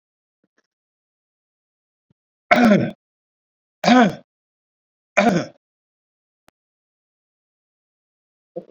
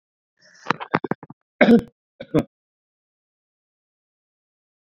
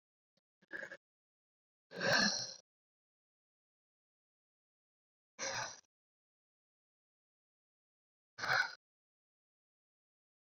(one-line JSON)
{"three_cough_length": "8.7 s", "three_cough_amplitude": 27155, "three_cough_signal_mean_std_ratio": 0.26, "cough_length": "4.9 s", "cough_amplitude": 28656, "cough_signal_mean_std_ratio": 0.21, "exhalation_length": "10.6 s", "exhalation_amplitude": 3543, "exhalation_signal_mean_std_ratio": 0.25, "survey_phase": "beta (2021-08-13 to 2022-03-07)", "age": "65+", "gender": "Male", "wearing_mask": "No", "symptom_runny_or_blocked_nose": true, "smoker_status": "Never smoked", "respiratory_condition_asthma": false, "respiratory_condition_other": false, "recruitment_source": "Test and Trace", "submission_delay": "2 days", "covid_test_result": "Positive", "covid_test_method": "ePCR"}